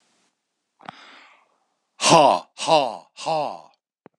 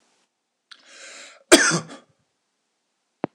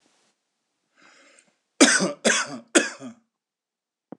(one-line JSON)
{"exhalation_length": "4.2 s", "exhalation_amplitude": 26028, "exhalation_signal_mean_std_ratio": 0.35, "cough_length": "3.3 s", "cough_amplitude": 26028, "cough_signal_mean_std_ratio": 0.23, "three_cough_length": "4.2 s", "three_cough_amplitude": 25265, "three_cough_signal_mean_std_ratio": 0.3, "survey_phase": "beta (2021-08-13 to 2022-03-07)", "age": "45-64", "gender": "Male", "wearing_mask": "No", "symptom_none": true, "smoker_status": "Ex-smoker", "respiratory_condition_asthma": false, "respiratory_condition_other": false, "recruitment_source": "REACT", "submission_delay": "2 days", "covid_test_result": "Negative", "covid_test_method": "RT-qPCR", "influenza_a_test_result": "Negative", "influenza_b_test_result": "Negative"}